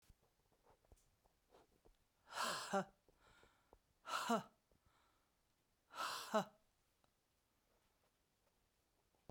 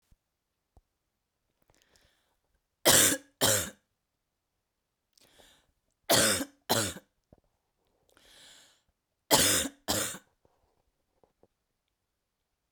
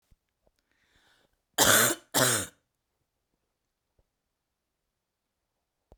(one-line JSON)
{"exhalation_length": "9.3 s", "exhalation_amplitude": 1666, "exhalation_signal_mean_std_ratio": 0.3, "three_cough_length": "12.7 s", "three_cough_amplitude": 15560, "three_cough_signal_mean_std_ratio": 0.28, "cough_length": "6.0 s", "cough_amplitude": 17920, "cough_signal_mean_std_ratio": 0.26, "survey_phase": "beta (2021-08-13 to 2022-03-07)", "age": "45-64", "gender": "Female", "wearing_mask": "No", "symptom_cough_any": true, "symptom_new_continuous_cough": true, "symptom_runny_or_blocked_nose": true, "symptom_shortness_of_breath": true, "symptom_sore_throat": true, "symptom_fatigue": true, "symptom_fever_high_temperature": true, "symptom_headache": true, "symptom_change_to_sense_of_smell_or_taste": true, "symptom_loss_of_taste": true, "symptom_other": true, "symptom_onset": "5 days", "smoker_status": "Never smoked", "respiratory_condition_asthma": false, "respiratory_condition_other": false, "recruitment_source": "Test and Trace", "submission_delay": "1 day", "covid_test_result": "Positive", "covid_test_method": "RT-qPCR", "covid_ct_value": 35.0, "covid_ct_gene": "ORF1ab gene"}